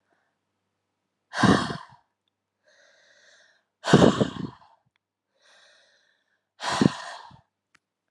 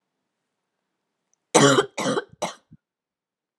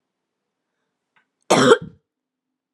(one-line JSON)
{"exhalation_length": "8.1 s", "exhalation_amplitude": 23892, "exhalation_signal_mean_std_ratio": 0.26, "three_cough_length": "3.6 s", "three_cough_amplitude": 24582, "three_cough_signal_mean_std_ratio": 0.29, "cough_length": "2.7 s", "cough_amplitude": 30831, "cough_signal_mean_std_ratio": 0.25, "survey_phase": "beta (2021-08-13 to 2022-03-07)", "age": "18-44", "gender": "Female", "wearing_mask": "No", "symptom_cough_any": true, "symptom_runny_or_blocked_nose": true, "symptom_fatigue": true, "symptom_fever_high_temperature": true, "symptom_headache": true, "symptom_onset": "3 days", "smoker_status": "Never smoked", "respiratory_condition_asthma": false, "respiratory_condition_other": false, "recruitment_source": "Test and Trace", "submission_delay": "2 days", "covid_test_result": "Positive", "covid_test_method": "RT-qPCR", "covid_ct_value": 30.1, "covid_ct_gene": "ORF1ab gene"}